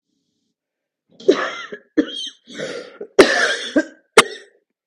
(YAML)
cough_length: 4.9 s
cough_amplitude: 32768
cough_signal_mean_std_ratio: 0.34
survey_phase: beta (2021-08-13 to 2022-03-07)
age: 45-64
gender: Female
wearing_mask: 'No'
symptom_cough_any: true
symptom_runny_or_blocked_nose: true
symptom_sore_throat: true
symptom_fatigue: true
smoker_status: Ex-smoker
respiratory_condition_asthma: false
respiratory_condition_other: false
recruitment_source: Test and Trace
submission_delay: 7 days
covid_test_result: Negative
covid_test_method: RT-qPCR